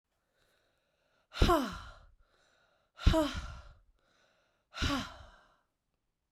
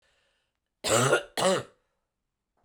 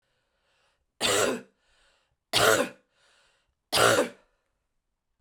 exhalation_length: 6.3 s
exhalation_amplitude: 8512
exhalation_signal_mean_std_ratio: 0.3
cough_length: 2.6 s
cough_amplitude: 10886
cough_signal_mean_std_ratio: 0.4
three_cough_length: 5.2 s
three_cough_amplitude: 16018
three_cough_signal_mean_std_ratio: 0.36
survey_phase: beta (2021-08-13 to 2022-03-07)
age: 45-64
gender: Female
wearing_mask: 'No'
symptom_cough_any: true
symptom_runny_or_blocked_nose: true
symptom_change_to_sense_of_smell_or_taste: true
symptom_onset: 3 days
smoker_status: Ex-smoker
respiratory_condition_asthma: false
respiratory_condition_other: false
recruitment_source: Test and Trace
submission_delay: 1 day
covid_test_result: Positive
covid_test_method: RT-qPCR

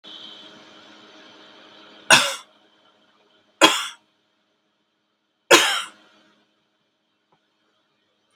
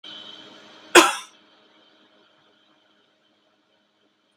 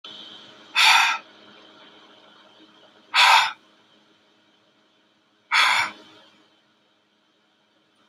three_cough_length: 8.4 s
three_cough_amplitude: 32768
three_cough_signal_mean_std_ratio: 0.23
cough_length: 4.4 s
cough_amplitude: 32768
cough_signal_mean_std_ratio: 0.18
exhalation_length: 8.1 s
exhalation_amplitude: 23160
exhalation_signal_mean_std_ratio: 0.32
survey_phase: beta (2021-08-13 to 2022-03-07)
age: 65+
gender: Female
wearing_mask: 'No'
symptom_fatigue: true
symptom_loss_of_taste: true
symptom_onset: 9 days
smoker_status: Ex-smoker
respiratory_condition_asthma: false
respiratory_condition_other: false
recruitment_source: Test and Trace
submission_delay: 1 day
covid_test_result: Positive
covid_test_method: RT-qPCR
covid_ct_value: 18.7
covid_ct_gene: ORF1ab gene
covid_ct_mean: 19.5
covid_viral_load: 410000 copies/ml
covid_viral_load_category: Low viral load (10K-1M copies/ml)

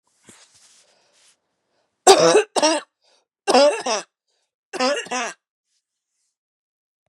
cough_length: 7.1 s
cough_amplitude: 32768
cough_signal_mean_std_ratio: 0.33
survey_phase: beta (2021-08-13 to 2022-03-07)
age: 45-64
gender: Female
wearing_mask: 'No'
symptom_cough_any: true
symptom_runny_or_blocked_nose: true
symptom_sore_throat: true
symptom_headache: true
symptom_other: true
symptom_onset: 2 days
smoker_status: Ex-smoker
respiratory_condition_asthma: false
respiratory_condition_other: false
recruitment_source: Test and Trace
submission_delay: 1 day
covid_test_result: Positive
covid_test_method: RT-qPCR
covid_ct_value: 27.6
covid_ct_gene: ORF1ab gene
covid_ct_mean: 27.6
covid_viral_load: 880 copies/ml
covid_viral_load_category: Minimal viral load (< 10K copies/ml)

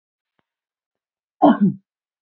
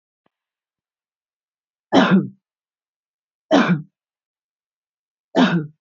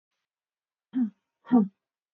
cough_length: 2.2 s
cough_amplitude: 27137
cough_signal_mean_std_ratio: 0.27
three_cough_length: 5.8 s
three_cough_amplitude: 27278
three_cough_signal_mean_std_ratio: 0.31
exhalation_length: 2.1 s
exhalation_amplitude: 10351
exhalation_signal_mean_std_ratio: 0.29
survey_phase: beta (2021-08-13 to 2022-03-07)
age: 45-64
gender: Female
wearing_mask: 'No'
symptom_none: true
symptom_onset: 12 days
smoker_status: Current smoker (e-cigarettes or vapes only)
respiratory_condition_asthma: false
respiratory_condition_other: false
recruitment_source: REACT
submission_delay: 2 days
covid_test_result: Negative
covid_test_method: RT-qPCR
influenza_a_test_result: Negative
influenza_b_test_result: Negative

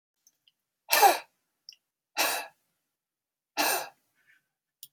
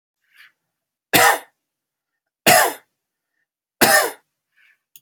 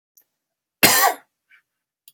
exhalation_length: 4.9 s
exhalation_amplitude: 17542
exhalation_signal_mean_std_ratio: 0.29
three_cough_length: 5.0 s
three_cough_amplitude: 32768
three_cough_signal_mean_std_ratio: 0.31
cough_length: 2.1 s
cough_amplitude: 32768
cough_signal_mean_std_ratio: 0.3
survey_phase: beta (2021-08-13 to 2022-03-07)
age: 45-64
gender: Male
wearing_mask: 'No'
symptom_cough_any: true
symptom_onset: 10 days
smoker_status: Never smoked
respiratory_condition_asthma: true
respiratory_condition_other: false
recruitment_source: REACT
submission_delay: 2 days
covid_test_result: Negative
covid_test_method: RT-qPCR
influenza_a_test_result: Unknown/Void
influenza_b_test_result: Unknown/Void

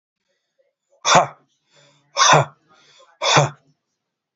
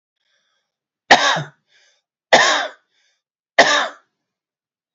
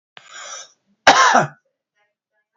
exhalation_length: 4.4 s
exhalation_amplitude: 27890
exhalation_signal_mean_std_ratio: 0.33
three_cough_length: 4.9 s
three_cough_amplitude: 32762
three_cough_signal_mean_std_ratio: 0.32
cough_length: 2.6 s
cough_amplitude: 32768
cough_signal_mean_std_ratio: 0.33
survey_phase: beta (2021-08-13 to 2022-03-07)
age: 45-64
gender: Male
wearing_mask: 'No'
symptom_none: true
smoker_status: Ex-smoker
respiratory_condition_asthma: false
respiratory_condition_other: false
recruitment_source: REACT
submission_delay: 2 days
covid_test_result: Negative
covid_test_method: RT-qPCR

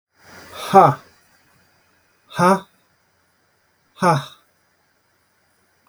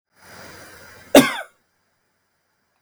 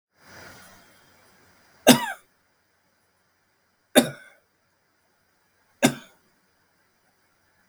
exhalation_length: 5.9 s
exhalation_amplitude: 32768
exhalation_signal_mean_std_ratio: 0.27
cough_length: 2.8 s
cough_amplitude: 32768
cough_signal_mean_std_ratio: 0.21
three_cough_length: 7.7 s
three_cough_amplitude: 32768
three_cough_signal_mean_std_ratio: 0.18
survey_phase: beta (2021-08-13 to 2022-03-07)
age: 45-64
gender: Male
wearing_mask: 'No'
symptom_none: true
smoker_status: Never smoked
respiratory_condition_asthma: false
respiratory_condition_other: false
recruitment_source: REACT
submission_delay: 9 days
covid_test_result: Negative
covid_test_method: RT-qPCR
influenza_a_test_result: Negative
influenza_b_test_result: Negative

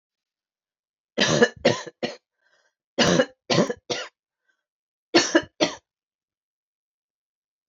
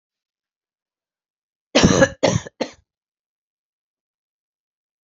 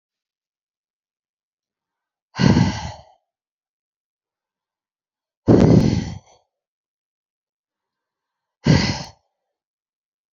three_cough_length: 7.7 s
three_cough_amplitude: 23017
three_cough_signal_mean_std_ratio: 0.32
cough_length: 5.0 s
cough_amplitude: 27961
cough_signal_mean_std_ratio: 0.24
exhalation_length: 10.3 s
exhalation_amplitude: 27543
exhalation_signal_mean_std_ratio: 0.27
survey_phase: beta (2021-08-13 to 2022-03-07)
age: 45-64
gender: Female
wearing_mask: 'No'
symptom_cough_any: true
symptom_sore_throat: true
symptom_fatigue: true
symptom_change_to_sense_of_smell_or_taste: true
symptom_loss_of_taste: true
symptom_onset: 2 days
smoker_status: Never smoked
respiratory_condition_asthma: false
respiratory_condition_other: false
recruitment_source: Test and Trace
submission_delay: 1 day
covid_test_result: Positive
covid_test_method: RT-qPCR
covid_ct_value: 27.8
covid_ct_gene: ORF1ab gene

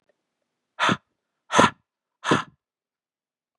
exhalation_length: 3.6 s
exhalation_amplitude: 32730
exhalation_signal_mean_std_ratio: 0.27
survey_phase: beta (2021-08-13 to 2022-03-07)
age: 18-44
gender: Male
wearing_mask: 'No'
symptom_cough_any: true
symptom_runny_or_blocked_nose: true
symptom_shortness_of_breath: true
symptom_fatigue: true
symptom_change_to_sense_of_smell_or_taste: true
symptom_loss_of_taste: true
symptom_onset: 5 days
smoker_status: Ex-smoker
respiratory_condition_asthma: false
respiratory_condition_other: false
recruitment_source: Test and Trace
submission_delay: 2 days
covid_test_result: Positive
covid_test_method: RT-qPCR
covid_ct_value: 22.4
covid_ct_gene: ORF1ab gene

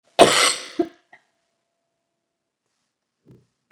three_cough_length: 3.7 s
three_cough_amplitude: 32768
three_cough_signal_mean_std_ratio: 0.24
survey_phase: beta (2021-08-13 to 2022-03-07)
age: 45-64
gender: Female
wearing_mask: 'No'
symptom_cough_any: true
symptom_runny_or_blocked_nose: true
symptom_sore_throat: true
symptom_fatigue: true
symptom_headache: true
symptom_change_to_sense_of_smell_or_taste: true
symptom_loss_of_taste: true
symptom_onset: 5 days
smoker_status: Never smoked
respiratory_condition_asthma: false
respiratory_condition_other: false
recruitment_source: Test and Trace
submission_delay: 2 days
covid_test_result: Positive
covid_test_method: RT-qPCR
covid_ct_value: 16.3
covid_ct_gene: ORF1ab gene
covid_ct_mean: 16.6
covid_viral_load: 3700000 copies/ml
covid_viral_load_category: High viral load (>1M copies/ml)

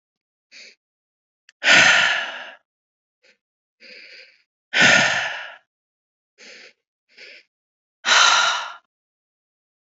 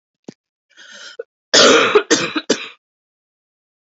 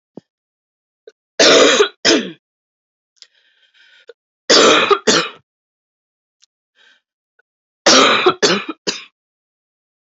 exhalation_length: 9.8 s
exhalation_amplitude: 27239
exhalation_signal_mean_std_ratio: 0.35
cough_length: 3.8 s
cough_amplitude: 30816
cough_signal_mean_std_ratio: 0.37
three_cough_length: 10.1 s
three_cough_amplitude: 32768
three_cough_signal_mean_std_ratio: 0.37
survey_phase: beta (2021-08-13 to 2022-03-07)
age: 45-64
gender: Female
wearing_mask: 'No'
symptom_cough_any: true
symptom_headache: true
smoker_status: Never smoked
respiratory_condition_asthma: false
respiratory_condition_other: false
recruitment_source: Test and Trace
submission_delay: 2 days
covid_test_result: Positive
covid_test_method: RT-qPCR
covid_ct_value: 16.7
covid_ct_gene: N gene
covid_ct_mean: 17.8
covid_viral_load: 1500000 copies/ml
covid_viral_load_category: High viral load (>1M copies/ml)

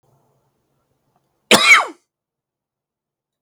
cough_length: 3.4 s
cough_amplitude: 32768
cough_signal_mean_std_ratio: 0.24
survey_phase: beta (2021-08-13 to 2022-03-07)
age: 45-64
gender: Male
wearing_mask: 'No'
symptom_cough_any: true
symptom_shortness_of_breath: true
symptom_fatigue: true
symptom_headache: true
symptom_change_to_sense_of_smell_or_taste: true
symptom_onset: 12 days
smoker_status: Ex-smoker
respiratory_condition_asthma: true
respiratory_condition_other: false
recruitment_source: REACT
submission_delay: 4 days
covid_test_result: Positive
covid_test_method: RT-qPCR
covid_ct_value: 24.0
covid_ct_gene: E gene
influenza_a_test_result: Negative
influenza_b_test_result: Negative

